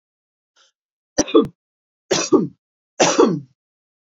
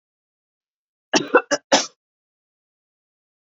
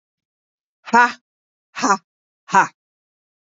three_cough_length: 4.2 s
three_cough_amplitude: 28343
three_cough_signal_mean_std_ratio: 0.35
cough_length: 3.6 s
cough_amplitude: 27296
cough_signal_mean_std_ratio: 0.23
exhalation_length: 3.4 s
exhalation_amplitude: 30518
exhalation_signal_mean_std_ratio: 0.28
survey_phase: beta (2021-08-13 to 2022-03-07)
age: 45-64
gender: Female
wearing_mask: 'No'
symptom_none: true
symptom_onset: 4 days
smoker_status: Ex-smoker
respiratory_condition_asthma: false
respiratory_condition_other: false
recruitment_source: REACT
submission_delay: 9 days
covid_test_result: Negative
covid_test_method: RT-qPCR
influenza_a_test_result: Negative
influenza_b_test_result: Negative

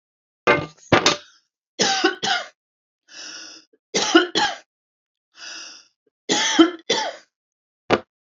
three_cough_length: 8.4 s
three_cough_amplitude: 32767
three_cough_signal_mean_std_ratio: 0.39
survey_phase: beta (2021-08-13 to 2022-03-07)
age: 65+
gender: Female
wearing_mask: 'No'
symptom_none: true
smoker_status: Never smoked
respiratory_condition_asthma: false
respiratory_condition_other: false
recruitment_source: REACT
submission_delay: 2 days
covid_test_result: Negative
covid_test_method: RT-qPCR
influenza_a_test_result: Negative
influenza_b_test_result: Negative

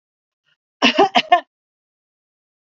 cough_length: 2.7 s
cough_amplitude: 32768
cough_signal_mean_std_ratio: 0.28
survey_phase: beta (2021-08-13 to 2022-03-07)
age: 45-64
gender: Female
wearing_mask: 'No'
symptom_sore_throat: true
symptom_fatigue: true
symptom_headache: true
symptom_change_to_sense_of_smell_or_taste: true
symptom_loss_of_taste: true
symptom_other: true
symptom_onset: 4 days
smoker_status: Ex-smoker
respiratory_condition_asthma: false
respiratory_condition_other: false
recruitment_source: Test and Trace
submission_delay: 1 day
covid_test_result: Positive
covid_test_method: RT-qPCR
covid_ct_value: 21.9
covid_ct_gene: ORF1ab gene
covid_ct_mean: 22.6
covid_viral_load: 40000 copies/ml
covid_viral_load_category: Low viral load (10K-1M copies/ml)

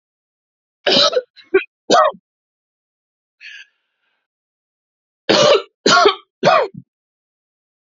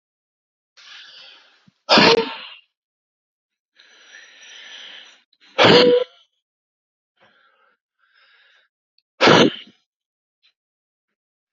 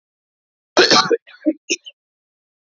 three_cough_length: 7.9 s
three_cough_amplitude: 31323
three_cough_signal_mean_std_ratio: 0.36
exhalation_length: 11.5 s
exhalation_amplitude: 31716
exhalation_signal_mean_std_ratio: 0.27
cough_length: 2.6 s
cough_amplitude: 31898
cough_signal_mean_std_ratio: 0.34
survey_phase: alpha (2021-03-01 to 2021-08-12)
age: 18-44
gender: Male
wearing_mask: 'No'
symptom_fatigue: true
smoker_status: Never smoked
respiratory_condition_asthma: false
respiratory_condition_other: false
recruitment_source: REACT
submission_delay: 2 days
covid_test_result: Negative
covid_test_method: RT-qPCR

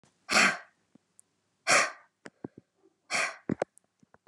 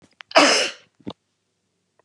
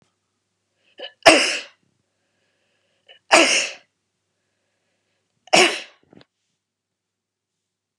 exhalation_length: 4.3 s
exhalation_amplitude: 10964
exhalation_signal_mean_std_ratio: 0.32
cough_length: 2.0 s
cough_amplitude: 29812
cough_signal_mean_std_ratio: 0.33
three_cough_length: 8.0 s
three_cough_amplitude: 32768
three_cough_signal_mean_std_ratio: 0.25
survey_phase: beta (2021-08-13 to 2022-03-07)
age: 45-64
gender: Female
wearing_mask: 'No'
symptom_none: true
smoker_status: Never smoked
respiratory_condition_asthma: false
respiratory_condition_other: false
recruitment_source: REACT
submission_delay: 1 day
covid_test_result: Negative
covid_test_method: RT-qPCR
influenza_a_test_result: Negative
influenza_b_test_result: Negative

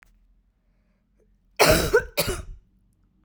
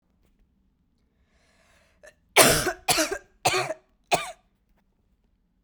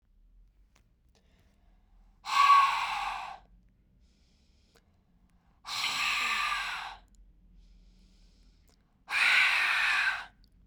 cough_length: 3.2 s
cough_amplitude: 28661
cough_signal_mean_std_ratio: 0.34
three_cough_length: 5.6 s
three_cough_amplitude: 32767
three_cough_signal_mean_std_ratio: 0.31
exhalation_length: 10.7 s
exhalation_amplitude: 9552
exhalation_signal_mean_std_ratio: 0.45
survey_phase: beta (2021-08-13 to 2022-03-07)
age: 18-44
gender: Female
wearing_mask: 'No'
symptom_none: true
smoker_status: Never smoked
respiratory_condition_asthma: false
respiratory_condition_other: false
recruitment_source: REACT
submission_delay: 1 day
covid_test_result: Negative
covid_test_method: RT-qPCR
influenza_a_test_result: Negative
influenza_b_test_result: Negative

